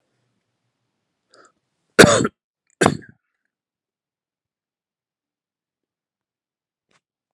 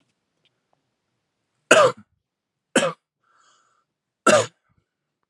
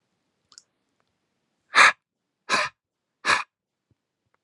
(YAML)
cough_length: 7.3 s
cough_amplitude: 32768
cough_signal_mean_std_ratio: 0.16
three_cough_length: 5.3 s
three_cough_amplitude: 32767
three_cough_signal_mean_std_ratio: 0.24
exhalation_length: 4.4 s
exhalation_amplitude: 27668
exhalation_signal_mean_std_ratio: 0.24
survey_phase: alpha (2021-03-01 to 2021-08-12)
age: 18-44
gender: Male
wearing_mask: 'No'
symptom_shortness_of_breath: true
symptom_fatigue: true
symptom_fever_high_temperature: true
symptom_headache: true
symptom_onset: 9 days
smoker_status: Never smoked
respiratory_condition_asthma: false
respiratory_condition_other: false
recruitment_source: Test and Trace
submission_delay: 6 days
covid_test_result: Positive
covid_test_method: RT-qPCR
covid_ct_value: 16.9
covid_ct_gene: N gene
covid_ct_mean: 17.1
covid_viral_load: 2400000 copies/ml
covid_viral_load_category: High viral load (>1M copies/ml)